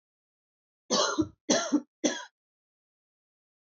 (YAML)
three_cough_length: 3.8 s
three_cough_amplitude: 10382
three_cough_signal_mean_std_ratio: 0.35
survey_phase: alpha (2021-03-01 to 2021-08-12)
age: 18-44
gender: Female
wearing_mask: 'No'
symptom_none: true
smoker_status: Never smoked
respiratory_condition_asthma: false
respiratory_condition_other: false
recruitment_source: REACT
submission_delay: 1 day
covid_test_result: Negative
covid_test_method: RT-qPCR